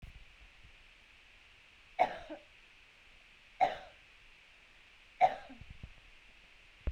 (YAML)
three_cough_length: 6.9 s
three_cough_amplitude: 6283
three_cough_signal_mean_std_ratio: 0.28
survey_phase: beta (2021-08-13 to 2022-03-07)
age: 18-44
gender: Female
wearing_mask: 'No'
symptom_cough_any: true
symptom_runny_or_blocked_nose: true
symptom_onset: 3 days
smoker_status: Never smoked
respiratory_condition_asthma: false
respiratory_condition_other: false
recruitment_source: Test and Trace
submission_delay: 1 day
covid_test_result: Positive
covid_test_method: RT-qPCR
covid_ct_value: 17.4
covid_ct_gene: ORF1ab gene